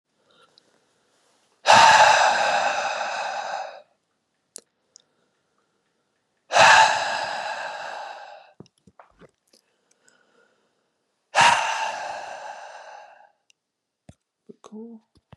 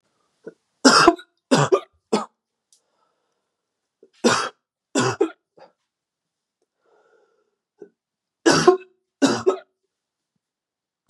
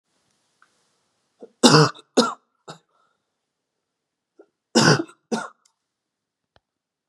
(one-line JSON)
{"exhalation_length": "15.4 s", "exhalation_amplitude": 30468, "exhalation_signal_mean_std_ratio": 0.36, "three_cough_length": "11.1 s", "three_cough_amplitude": 32767, "three_cough_signal_mean_std_ratio": 0.29, "cough_length": "7.1 s", "cough_amplitude": 32767, "cough_signal_mean_std_ratio": 0.25, "survey_phase": "beta (2021-08-13 to 2022-03-07)", "age": "18-44", "gender": "Male", "wearing_mask": "No", "symptom_none": true, "smoker_status": "Never smoked", "respiratory_condition_asthma": false, "respiratory_condition_other": false, "recruitment_source": "REACT", "submission_delay": "1 day", "covid_test_result": "Negative", "covid_test_method": "RT-qPCR", "influenza_a_test_result": "Negative", "influenza_b_test_result": "Negative"}